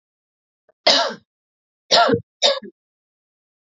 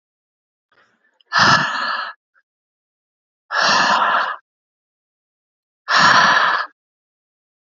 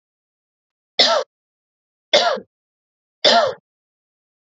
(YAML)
cough_length: 3.8 s
cough_amplitude: 29812
cough_signal_mean_std_ratio: 0.34
exhalation_length: 7.7 s
exhalation_amplitude: 32767
exhalation_signal_mean_std_ratio: 0.44
three_cough_length: 4.4 s
three_cough_amplitude: 32768
three_cough_signal_mean_std_ratio: 0.33
survey_phase: alpha (2021-03-01 to 2021-08-12)
age: 45-64
gender: Female
wearing_mask: 'No'
symptom_none: true
smoker_status: Ex-smoker
respiratory_condition_asthma: false
respiratory_condition_other: false
recruitment_source: REACT
submission_delay: 6 days
covid_test_result: Negative
covid_test_method: RT-qPCR